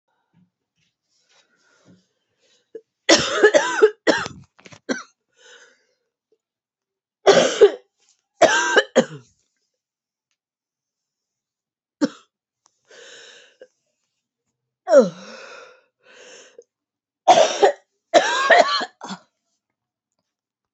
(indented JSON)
{
  "three_cough_length": "20.7 s",
  "three_cough_amplitude": 31124,
  "three_cough_signal_mean_std_ratio": 0.3,
  "survey_phase": "alpha (2021-03-01 to 2021-08-12)",
  "age": "18-44",
  "gender": "Female",
  "wearing_mask": "No",
  "symptom_cough_any": true,
  "symptom_new_continuous_cough": true,
  "symptom_shortness_of_breath": true,
  "symptom_abdominal_pain": true,
  "symptom_fatigue": true,
  "symptom_fever_high_temperature": true,
  "symptom_headache": true,
  "symptom_change_to_sense_of_smell_or_taste": true,
  "symptom_loss_of_taste": true,
  "symptom_onset": "3 days",
  "smoker_status": "Never smoked",
  "respiratory_condition_asthma": false,
  "respiratory_condition_other": false,
  "recruitment_source": "Test and Trace",
  "submission_delay": "1 day",
  "covid_test_result": "Positive",
  "covid_test_method": "RT-qPCR",
  "covid_ct_value": 17.9,
  "covid_ct_gene": "N gene",
  "covid_ct_mean": 18.6,
  "covid_viral_load": "790000 copies/ml",
  "covid_viral_load_category": "Low viral load (10K-1M copies/ml)"
}